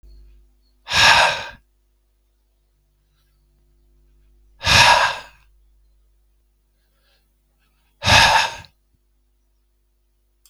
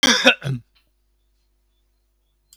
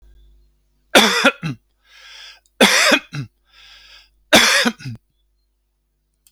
{"exhalation_length": "10.5 s", "exhalation_amplitude": 32768, "exhalation_signal_mean_std_ratio": 0.3, "cough_length": "2.6 s", "cough_amplitude": 32768, "cough_signal_mean_std_ratio": 0.3, "three_cough_length": "6.3 s", "three_cough_amplitude": 32768, "three_cough_signal_mean_std_ratio": 0.37, "survey_phase": "beta (2021-08-13 to 2022-03-07)", "age": "65+", "gender": "Male", "wearing_mask": "No", "symptom_none": true, "smoker_status": "Never smoked", "respiratory_condition_asthma": false, "respiratory_condition_other": false, "recruitment_source": "REACT", "submission_delay": "5 days", "covid_test_result": "Negative", "covid_test_method": "RT-qPCR", "influenza_a_test_result": "Negative", "influenza_b_test_result": "Negative"}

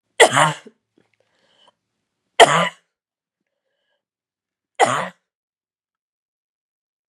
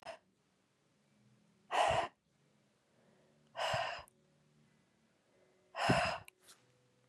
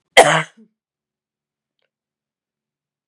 {"three_cough_length": "7.1 s", "three_cough_amplitude": 32768, "three_cough_signal_mean_std_ratio": 0.23, "exhalation_length": "7.1 s", "exhalation_amplitude": 3772, "exhalation_signal_mean_std_ratio": 0.34, "cough_length": "3.1 s", "cough_amplitude": 32768, "cough_signal_mean_std_ratio": 0.2, "survey_phase": "beta (2021-08-13 to 2022-03-07)", "age": "18-44", "gender": "Female", "wearing_mask": "No", "symptom_cough_any": true, "symptom_runny_or_blocked_nose": true, "symptom_fatigue": true, "symptom_headache": true, "symptom_change_to_sense_of_smell_or_taste": true, "symptom_loss_of_taste": true, "symptom_onset": "3 days", "smoker_status": "Never smoked", "respiratory_condition_asthma": false, "respiratory_condition_other": false, "recruitment_source": "Test and Trace", "submission_delay": "2 days", "covid_test_result": "Positive", "covid_test_method": "RT-qPCR", "covid_ct_value": 12.7, "covid_ct_gene": "N gene", "covid_ct_mean": 13.4, "covid_viral_load": "41000000 copies/ml", "covid_viral_load_category": "High viral load (>1M copies/ml)"}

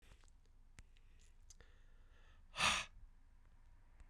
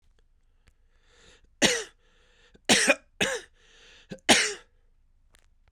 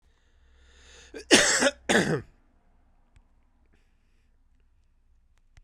{"exhalation_length": "4.1 s", "exhalation_amplitude": 2768, "exhalation_signal_mean_std_ratio": 0.36, "three_cough_length": "5.7 s", "three_cough_amplitude": 21228, "three_cough_signal_mean_std_ratio": 0.3, "cough_length": "5.6 s", "cough_amplitude": 27671, "cough_signal_mean_std_ratio": 0.29, "survey_phase": "beta (2021-08-13 to 2022-03-07)", "age": "45-64", "gender": "Male", "wearing_mask": "No", "symptom_cough_any": true, "symptom_new_continuous_cough": true, "symptom_runny_or_blocked_nose": true, "symptom_shortness_of_breath": true, "symptom_diarrhoea": true, "symptom_fatigue": true, "symptom_headache": true, "symptom_onset": "4 days", "smoker_status": "Ex-smoker", "respiratory_condition_asthma": false, "respiratory_condition_other": false, "recruitment_source": "Test and Trace", "submission_delay": "3 days", "covid_test_result": "Positive", "covid_test_method": "RT-qPCR"}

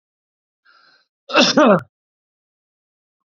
{"cough_length": "3.2 s", "cough_amplitude": 31318, "cough_signal_mean_std_ratio": 0.29, "survey_phase": "beta (2021-08-13 to 2022-03-07)", "age": "45-64", "gender": "Male", "wearing_mask": "No", "symptom_none": true, "smoker_status": "Never smoked", "respiratory_condition_asthma": false, "respiratory_condition_other": false, "recruitment_source": "REACT", "submission_delay": "1 day", "covid_test_result": "Negative", "covid_test_method": "RT-qPCR"}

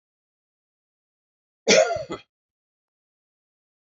{"cough_length": "3.9 s", "cough_amplitude": 19570, "cough_signal_mean_std_ratio": 0.22, "survey_phase": "beta (2021-08-13 to 2022-03-07)", "age": "65+", "gender": "Male", "wearing_mask": "No", "symptom_none": true, "smoker_status": "Ex-smoker", "respiratory_condition_asthma": false, "respiratory_condition_other": false, "recruitment_source": "REACT", "submission_delay": "4 days", "covid_test_result": "Negative", "covid_test_method": "RT-qPCR", "influenza_a_test_result": "Negative", "influenza_b_test_result": "Negative"}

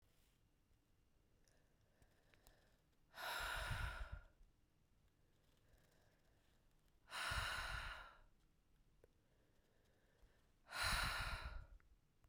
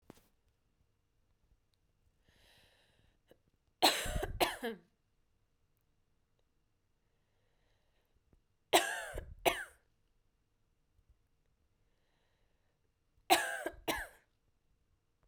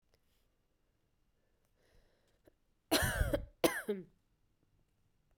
{"exhalation_length": "12.3 s", "exhalation_amplitude": 1148, "exhalation_signal_mean_std_ratio": 0.44, "three_cough_length": "15.3 s", "three_cough_amplitude": 9101, "three_cough_signal_mean_std_ratio": 0.24, "cough_length": "5.4 s", "cough_amplitude": 7254, "cough_signal_mean_std_ratio": 0.29, "survey_phase": "beta (2021-08-13 to 2022-03-07)", "age": "45-64", "gender": "Female", "wearing_mask": "No", "symptom_runny_or_blocked_nose": true, "symptom_fatigue": true, "symptom_headache": true, "smoker_status": "Never smoked", "respiratory_condition_asthma": false, "respiratory_condition_other": false, "recruitment_source": "Test and Trace", "submission_delay": "2 days", "covid_test_result": "Positive", "covid_test_method": "RT-qPCR"}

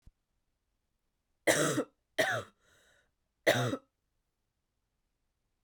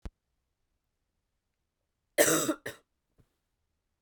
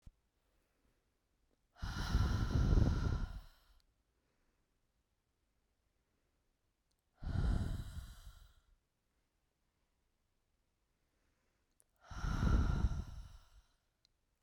{"three_cough_length": "5.6 s", "three_cough_amplitude": 8623, "three_cough_signal_mean_std_ratio": 0.31, "cough_length": "4.0 s", "cough_amplitude": 11941, "cough_signal_mean_std_ratio": 0.24, "exhalation_length": "14.4 s", "exhalation_amplitude": 3957, "exhalation_signal_mean_std_ratio": 0.38, "survey_phase": "beta (2021-08-13 to 2022-03-07)", "age": "18-44", "gender": "Female", "wearing_mask": "No", "symptom_sore_throat": true, "symptom_fatigue": true, "symptom_headache": true, "smoker_status": "Never smoked", "respiratory_condition_asthma": false, "respiratory_condition_other": false, "recruitment_source": "Test and Trace", "submission_delay": "1 day", "covid_test_result": "Positive", "covid_test_method": "RT-qPCR", "covid_ct_value": 20.7, "covid_ct_gene": "ORF1ab gene", "covid_ct_mean": 21.1, "covid_viral_load": "120000 copies/ml", "covid_viral_load_category": "Low viral load (10K-1M copies/ml)"}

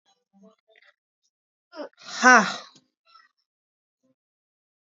{"exhalation_length": "4.9 s", "exhalation_amplitude": 28689, "exhalation_signal_mean_std_ratio": 0.19, "survey_phase": "beta (2021-08-13 to 2022-03-07)", "age": "18-44", "gender": "Female", "wearing_mask": "No", "symptom_shortness_of_breath": true, "symptom_diarrhoea": true, "symptom_headache": true, "symptom_onset": "13 days", "smoker_status": "Current smoker (1 to 10 cigarettes per day)", "respiratory_condition_asthma": false, "respiratory_condition_other": false, "recruitment_source": "REACT", "submission_delay": "2 days", "covid_test_result": "Negative", "covid_test_method": "RT-qPCR"}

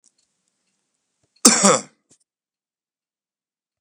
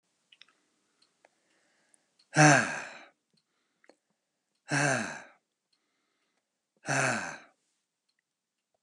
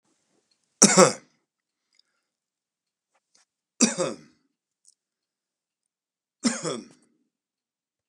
{"cough_length": "3.8 s", "cough_amplitude": 32768, "cough_signal_mean_std_ratio": 0.22, "exhalation_length": "8.8 s", "exhalation_amplitude": 15102, "exhalation_signal_mean_std_ratio": 0.27, "three_cough_length": "8.1 s", "three_cough_amplitude": 32767, "three_cough_signal_mean_std_ratio": 0.2, "survey_phase": "beta (2021-08-13 to 2022-03-07)", "age": "45-64", "gender": "Male", "wearing_mask": "No", "symptom_runny_or_blocked_nose": true, "smoker_status": "Current smoker (1 to 10 cigarettes per day)", "respiratory_condition_asthma": false, "respiratory_condition_other": false, "recruitment_source": "REACT", "submission_delay": "1 day", "covid_test_result": "Negative", "covid_test_method": "RT-qPCR"}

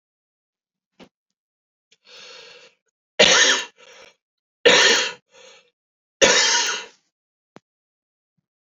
{"three_cough_length": "8.6 s", "three_cough_amplitude": 29061, "three_cough_signal_mean_std_ratio": 0.33, "survey_phase": "beta (2021-08-13 to 2022-03-07)", "age": "18-44", "gender": "Male", "wearing_mask": "No", "symptom_none": true, "smoker_status": "Ex-smoker", "respiratory_condition_asthma": true, "respiratory_condition_other": false, "recruitment_source": "REACT", "submission_delay": "5 days", "covid_test_result": "Negative", "covid_test_method": "RT-qPCR", "influenza_a_test_result": "Negative", "influenza_b_test_result": "Negative"}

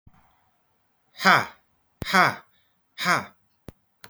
{"exhalation_length": "4.1 s", "exhalation_amplitude": 26846, "exhalation_signal_mean_std_ratio": 0.29, "survey_phase": "beta (2021-08-13 to 2022-03-07)", "age": "45-64", "gender": "Male", "wearing_mask": "No", "symptom_none": true, "smoker_status": "Never smoked", "respiratory_condition_asthma": false, "respiratory_condition_other": false, "recruitment_source": "REACT", "submission_delay": "25 days", "covid_test_result": "Negative", "covid_test_method": "RT-qPCR"}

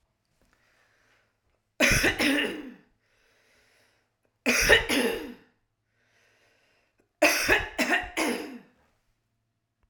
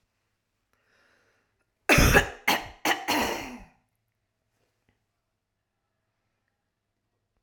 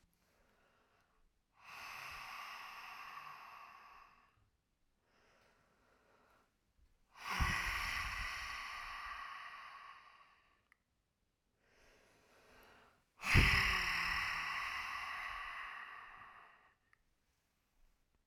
{"three_cough_length": "9.9 s", "three_cough_amplitude": 19240, "three_cough_signal_mean_std_ratio": 0.4, "cough_length": "7.4 s", "cough_amplitude": 19171, "cough_signal_mean_std_ratio": 0.28, "exhalation_length": "18.3 s", "exhalation_amplitude": 5309, "exhalation_signal_mean_std_ratio": 0.41, "survey_phase": "alpha (2021-03-01 to 2021-08-12)", "age": "45-64", "gender": "Female", "wearing_mask": "No", "symptom_none": true, "smoker_status": "Never smoked", "respiratory_condition_asthma": true, "respiratory_condition_other": false, "recruitment_source": "REACT", "submission_delay": "2 days", "covid_test_result": "Negative", "covid_test_method": "RT-qPCR"}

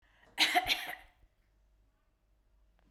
{"cough_length": "2.9 s", "cough_amplitude": 6498, "cough_signal_mean_std_ratio": 0.31, "survey_phase": "beta (2021-08-13 to 2022-03-07)", "age": "45-64", "gender": "Female", "wearing_mask": "No", "symptom_sore_throat": true, "smoker_status": "Never smoked", "respiratory_condition_asthma": false, "respiratory_condition_other": false, "recruitment_source": "REACT", "submission_delay": "3 days", "covid_test_result": "Negative", "covid_test_method": "RT-qPCR"}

